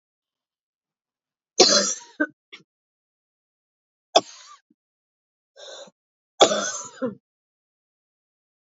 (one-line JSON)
{"three_cough_length": "8.7 s", "three_cough_amplitude": 30196, "three_cough_signal_mean_std_ratio": 0.23, "survey_phase": "beta (2021-08-13 to 2022-03-07)", "age": "45-64", "gender": "Female", "wearing_mask": "No", "symptom_cough_any": true, "symptom_diarrhoea": true, "symptom_fatigue": true, "smoker_status": "Never smoked", "respiratory_condition_asthma": false, "respiratory_condition_other": false, "recruitment_source": "Test and Trace", "submission_delay": "2 days", "covid_test_result": "Positive", "covid_test_method": "RT-qPCR", "covid_ct_value": 19.8, "covid_ct_gene": "ORF1ab gene", "covid_ct_mean": 20.4, "covid_viral_load": "200000 copies/ml", "covid_viral_load_category": "Low viral load (10K-1M copies/ml)"}